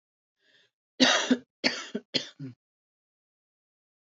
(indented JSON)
{
  "cough_length": "4.0 s",
  "cough_amplitude": 16504,
  "cough_signal_mean_std_ratio": 0.3,
  "survey_phase": "beta (2021-08-13 to 2022-03-07)",
  "age": "45-64",
  "gender": "Female",
  "wearing_mask": "No",
  "symptom_cough_any": true,
  "symptom_shortness_of_breath": true,
  "symptom_sore_throat": true,
  "symptom_fatigue": true,
  "symptom_fever_high_temperature": true,
  "symptom_headache": true,
  "symptom_change_to_sense_of_smell_or_taste": true,
  "symptom_loss_of_taste": true,
  "symptom_onset": "4 days",
  "smoker_status": "Ex-smoker",
  "respiratory_condition_asthma": false,
  "respiratory_condition_other": false,
  "recruitment_source": "Test and Trace",
  "submission_delay": "2 days",
  "covid_test_result": "Positive",
  "covid_test_method": "RT-qPCR",
  "covid_ct_value": 25.3,
  "covid_ct_gene": "ORF1ab gene",
  "covid_ct_mean": 25.7,
  "covid_viral_load": "3600 copies/ml",
  "covid_viral_load_category": "Minimal viral load (< 10K copies/ml)"
}